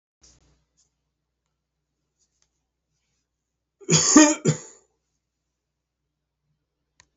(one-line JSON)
{"cough_length": "7.2 s", "cough_amplitude": 27504, "cough_signal_mean_std_ratio": 0.21, "survey_phase": "beta (2021-08-13 to 2022-03-07)", "age": "65+", "gender": "Male", "wearing_mask": "Yes", "symptom_other": true, "smoker_status": "Never smoked", "respiratory_condition_asthma": false, "respiratory_condition_other": false, "recruitment_source": "Test and Trace", "submission_delay": "2 days", "covid_test_result": "Positive", "covid_test_method": "RT-qPCR", "covid_ct_value": 27.5, "covid_ct_gene": "ORF1ab gene", "covid_ct_mean": 28.4, "covid_viral_load": "500 copies/ml", "covid_viral_load_category": "Minimal viral load (< 10K copies/ml)"}